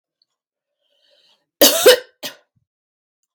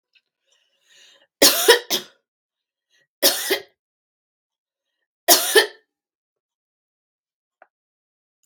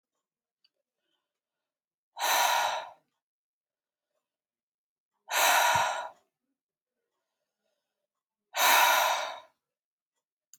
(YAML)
cough_length: 3.3 s
cough_amplitude: 32768
cough_signal_mean_std_ratio: 0.25
three_cough_length: 8.5 s
three_cough_amplitude: 32768
three_cough_signal_mean_std_ratio: 0.25
exhalation_length: 10.6 s
exhalation_amplitude: 11950
exhalation_signal_mean_std_ratio: 0.36
survey_phase: beta (2021-08-13 to 2022-03-07)
age: 65+
gender: Female
wearing_mask: 'No'
symptom_none: true
symptom_onset: 12 days
smoker_status: Never smoked
respiratory_condition_asthma: false
respiratory_condition_other: false
recruitment_source: REACT
submission_delay: 2 days
covid_test_result: Negative
covid_test_method: RT-qPCR
influenza_a_test_result: Negative
influenza_b_test_result: Negative